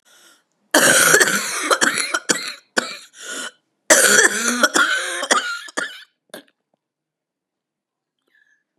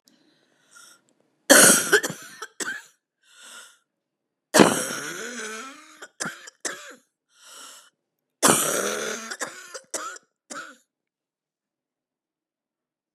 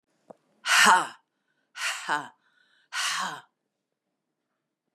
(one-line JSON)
{"cough_length": "8.8 s", "cough_amplitude": 32768, "cough_signal_mean_std_ratio": 0.47, "three_cough_length": "13.1 s", "three_cough_amplitude": 32716, "three_cough_signal_mean_std_ratio": 0.3, "exhalation_length": "4.9 s", "exhalation_amplitude": 18130, "exhalation_signal_mean_std_ratio": 0.33, "survey_phase": "beta (2021-08-13 to 2022-03-07)", "age": "65+", "gender": "Female", "wearing_mask": "No", "symptom_new_continuous_cough": true, "symptom_runny_or_blocked_nose": true, "symptom_headache": true, "symptom_other": true, "symptom_onset": "2 days", "smoker_status": "Never smoked", "respiratory_condition_asthma": false, "respiratory_condition_other": false, "recruitment_source": "Test and Trace", "submission_delay": "1 day", "covid_test_result": "Positive", "covid_test_method": "ePCR"}